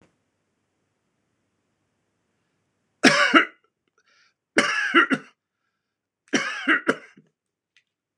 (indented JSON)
{
  "three_cough_length": "8.2 s",
  "three_cough_amplitude": 26028,
  "three_cough_signal_mean_std_ratio": 0.3,
  "survey_phase": "beta (2021-08-13 to 2022-03-07)",
  "age": "65+",
  "gender": "Male",
  "wearing_mask": "No",
  "symptom_none": true,
  "smoker_status": "Never smoked",
  "respiratory_condition_asthma": false,
  "respiratory_condition_other": false,
  "recruitment_source": "REACT",
  "submission_delay": "2 days",
  "covid_test_result": "Negative",
  "covid_test_method": "RT-qPCR",
  "influenza_a_test_result": "Negative",
  "influenza_b_test_result": "Negative"
}